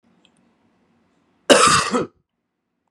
{
  "cough_length": "2.9 s",
  "cough_amplitude": 32768,
  "cough_signal_mean_std_ratio": 0.32,
  "survey_phase": "beta (2021-08-13 to 2022-03-07)",
  "age": "18-44",
  "gender": "Male",
  "wearing_mask": "No",
  "symptom_cough_any": true,
  "symptom_new_continuous_cough": true,
  "symptom_runny_or_blocked_nose": true,
  "symptom_shortness_of_breath": true,
  "symptom_sore_throat": true,
  "symptom_fatigue": true,
  "symptom_headache": true,
  "smoker_status": "Never smoked",
  "respiratory_condition_asthma": false,
  "respiratory_condition_other": false,
  "recruitment_source": "Test and Trace",
  "submission_delay": "1 day",
  "covid_test_result": "Positive",
  "covid_test_method": "RT-qPCR",
  "covid_ct_value": 19.4,
  "covid_ct_gene": "N gene"
}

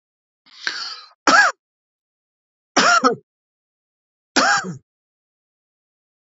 {
  "three_cough_length": "6.2 s",
  "three_cough_amplitude": 30899,
  "three_cough_signal_mean_std_ratio": 0.33,
  "survey_phase": "beta (2021-08-13 to 2022-03-07)",
  "age": "65+",
  "gender": "Male",
  "wearing_mask": "No",
  "symptom_none": true,
  "smoker_status": "Never smoked",
  "respiratory_condition_asthma": false,
  "respiratory_condition_other": false,
  "recruitment_source": "REACT",
  "submission_delay": "1 day",
  "covid_test_result": "Negative",
  "covid_test_method": "RT-qPCR",
  "influenza_a_test_result": "Negative",
  "influenza_b_test_result": "Negative"
}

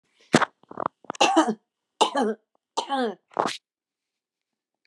{
  "three_cough_length": "4.9 s",
  "three_cough_amplitude": 30107,
  "three_cough_signal_mean_std_ratio": 0.36,
  "survey_phase": "beta (2021-08-13 to 2022-03-07)",
  "age": "45-64",
  "gender": "Female",
  "wearing_mask": "No",
  "symptom_none": true,
  "smoker_status": "Never smoked",
  "respiratory_condition_asthma": false,
  "respiratory_condition_other": false,
  "recruitment_source": "REACT",
  "submission_delay": "2 days",
  "covid_test_result": "Negative",
  "covid_test_method": "RT-qPCR",
  "influenza_a_test_result": "Negative",
  "influenza_b_test_result": "Negative"
}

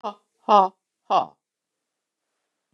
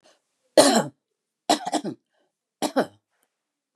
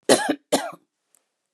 {
  "exhalation_length": "2.7 s",
  "exhalation_amplitude": 23733,
  "exhalation_signal_mean_std_ratio": 0.25,
  "three_cough_length": "3.8 s",
  "three_cough_amplitude": 31189,
  "three_cough_signal_mean_std_ratio": 0.3,
  "cough_length": "1.5 s",
  "cough_amplitude": 29316,
  "cough_signal_mean_std_ratio": 0.35,
  "survey_phase": "beta (2021-08-13 to 2022-03-07)",
  "age": "65+",
  "gender": "Female",
  "wearing_mask": "No",
  "symptom_none": true,
  "smoker_status": "Never smoked",
  "respiratory_condition_asthma": false,
  "respiratory_condition_other": false,
  "recruitment_source": "REACT",
  "submission_delay": "1 day",
  "covid_test_result": "Negative",
  "covid_test_method": "RT-qPCR",
  "influenza_a_test_result": "Negative",
  "influenza_b_test_result": "Negative"
}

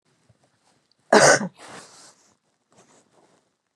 {
  "cough_length": "3.8 s",
  "cough_amplitude": 30977,
  "cough_signal_mean_std_ratio": 0.23,
  "survey_phase": "beta (2021-08-13 to 2022-03-07)",
  "age": "45-64",
  "gender": "Female",
  "wearing_mask": "No",
  "symptom_cough_any": true,
  "symptom_runny_or_blocked_nose": true,
  "symptom_sore_throat": true,
  "symptom_abdominal_pain": true,
  "symptom_fatigue": true,
  "symptom_headache": true,
  "smoker_status": "Ex-smoker",
  "respiratory_condition_asthma": false,
  "respiratory_condition_other": false,
  "recruitment_source": "Test and Trace",
  "submission_delay": "2 days",
  "covid_test_result": "Positive",
  "covid_test_method": "LFT"
}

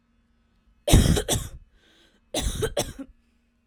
{
  "cough_length": "3.7 s",
  "cough_amplitude": 20528,
  "cough_signal_mean_std_ratio": 0.38,
  "survey_phase": "alpha (2021-03-01 to 2021-08-12)",
  "age": "18-44",
  "gender": "Female",
  "wearing_mask": "No",
  "symptom_none": true,
  "smoker_status": "Never smoked",
  "respiratory_condition_asthma": false,
  "respiratory_condition_other": false,
  "recruitment_source": "REACT",
  "submission_delay": "3 days",
  "covid_test_result": "Negative",
  "covid_test_method": "RT-qPCR"
}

